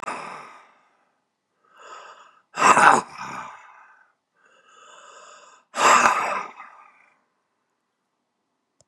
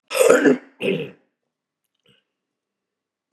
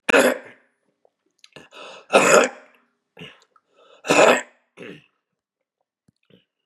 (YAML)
exhalation_length: 8.9 s
exhalation_amplitude: 32767
exhalation_signal_mean_std_ratio: 0.3
cough_length: 3.3 s
cough_amplitude: 32767
cough_signal_mean_std_ratio: 0.34
three_cough_length: 6.7 s
three_cough_amplitude: 31488
three_cough_signal_mean_std_ratio: 0.31
survey_phase: beta (2021-08-13 to 2022-03-07)
age: 65+
gender: Male
wearing_mask: 'No'
symptom_none: true
smoker_status: Ex-smoker
respiratory_condition_asthma: true
respiratory_condition_other: true
recruitment_source: REACT
submission_delay: 2 days
covid_test_result: Negative
covid_test_method: RT-qPCR
influenza_a_test_result: Negative
influenza_b_test_result: Negative